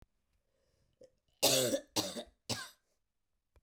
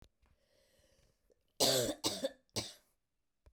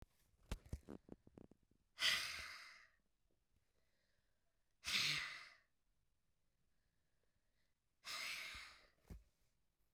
{"cough_length": "3.6 s", "cough_amplitude": 5755, "cough_signal_mean_std_ratio": 0.34, "three_cough_length": "3.5 s", "three_cough_amplitude": 4748, "three_cough_signal_mean_std_ratio": 0.34, "exhalation_length": "9.9 s", "exhalation_amplitude": 2061, "exhalation_signal_mean_std_ratio": 0.34, "survey_phase": "beta (2021-08-13 to 2022-03-07)", "age": "45-64", "gender": "Female", "wearing_mask": "No", "symptom_cough_any": true, "symptom_onset": "3 days", "smoker_status": "Never smoked", "respiratory_condition_asthma": false, "respiratory_condition_other": false, "recruitment_source": "Test and Trace", "submission_delay": "1 day", "covid_test_result": "Positive", "covid_test_method": "RT-qPCR", "covid_ct_value": 21.3, "covid_ct_gene": "ORF1ab gene"}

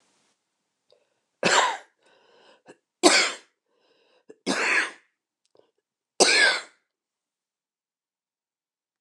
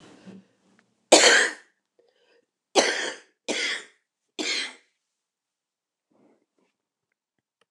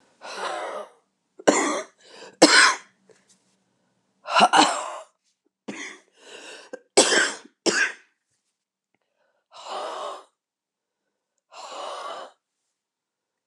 {"cough_length": "9.0 s", "cough_amplitude": 29203, "cough_signal_mean_std_ratio": 0.31, "three_cough_length": "7.7 s", "three_cough_amplitude": 29203, "three_cough_signal_mean_std_ratio": 0.28, "exhalation_length": "13.5 s", "exhalation_amplitude": 29111, "exhalation_signal_mean_std_ratio": 0.33, "survey_phase": "alpha (2021-03-01 to 2021-08-12)", "age": "65+", "gender": "Female", "wearing_mask": "No", "symptom_cough_any": true, "symptom_new_continuous_cough": true, "symptom_diarrhoea": true, "symptom_fatigue": true, "symptom_headache": true, "symptom_change_to_sense_of_smell_or_taste": true, "symptom_onset": "4 days", "smoker_status": "Ex-smoker", "respiratory_condition_asthma": true, "respiratory_condition_other": false, "recruitment_source": "Test and Trace", "submission_delay": "1 day", "covid_test_result": "Positive", "covid_test_method": "RT-qPCR", "covid_ct_value": 14.2, "covid_ct_gene": "ORF1ab gene", "covid_ct_mean": 15.0, "covid_viral_load": "12000000 copies/ml", "covid_viral_load_category": "High viral load (>1M copies/ml)"}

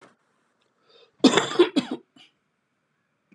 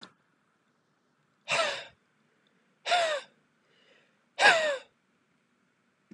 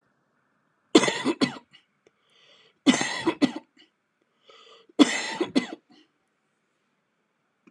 {"cough_length": "3.3 s", "cough_amplitude": 25967, "cough_signal_mean_std_ratio": 0.27, "exhalation_length": "6.1 s", "exhalation_amplitude": 17402, "exhalation_signal_mean_std_ratio": 0.31, "three_cough_length": "7.7 s", "three_cough_amplitude": 26360, "three_cough_signal_mean_std_ratio": 0.29, "survey_phase": "beta (2021-08-13 to 2022-03-07)", "age": "45-64", "gender": "Male", "wearing_mask": "No", "symptom_none": true, "smoker_status": "Never smoked", "respiratory_condition_asthma": true, "respiratory_condition_other": false, "recruitment_source": "REACT", "submission_delay": "1 day", "covid_test_result": "Negative", "covid_test_method": "RT-qPCR"}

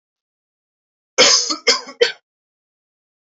{"three_cough_length": "3.2 s", "three_cough_amplitude": 30509, "three_cough_signal_mean_std_ratio": 0.32, "survey_phase": "beta (2021-08-13 to 2022-03-07)", "age": "18-44", "gender": "Male", "wearing_mask": "No", "symptom_none": true, "smoker_status": "Never smoked", "respiratory_condition_asthma": false, "respiratory_condition_other": false, "recruitment_source": "REACT", "submission_delay": "1 day", "covid_test_result": "Negative", "covid_test_method": "RT-qPCR"}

